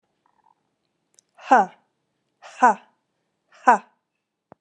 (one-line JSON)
{"exhalation_length": "4.6 s", "exhalation_amplitude": 30091, "exhalation_signal_mean_std_ratio": 0.23, "survey_phase": "alpha (2021-03-01 to 2021-08-12)", "age": "45-64", "gender": "Female", "wearing_mask": "No", "symptom_change_to_sense_of_smell_or_taste": true, "symptom_onset": "4 days", "smoker_status": "Never smoked", "respiratory_condition_asthma": false, "respiratory_condition_other": false, "recruitment_source": "Test and Trace", "submission_delay": "1 day", "covid_test_result": "Positive", "covid_test_method": "RT-qPCR", "covid_ct_value": 13.6, "covid_ct_gene": "ORF1ab gene", "covid_ct_mean": 14.0, "covid_viral_load": "25000000 copies/ml", "covid_viral_load_category": "High viral load (>1M copies/ml)"}